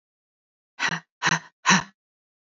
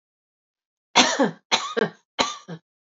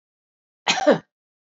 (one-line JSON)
{"exhalation_length": "2.6 s", "exhalation_amplitude": 23482, "exhalation_signal_mean_std_ratio": 0.32, "three_cough_length": "3.0 s", "three_cough_amplitude": 32768, "three_cough_signal_mean_std_ratio": 0.37, "cough_length": "1.5 s", "cough_amplitude": 21452, "cough_signal_mean_std_ratio": 0.31, "survey_phase": "beta (2021-08-13 to 2022-03-07)", "age": "45-64", "gender": "Female", "wearing_mask": "No", "symptom_abdominal_pain": true, "symptom_fatigue": true, "symptom_headache": true, "symptom_other": true, "smoker_status": "Never smoked", "respiratory_condition_asthma": false, "respiratory_condition_other": false, "recruitment_source": "Test and Trace", "submission_delay": "1 day", "covid_test_result": "Positive", "covid_test_method": "LFT"}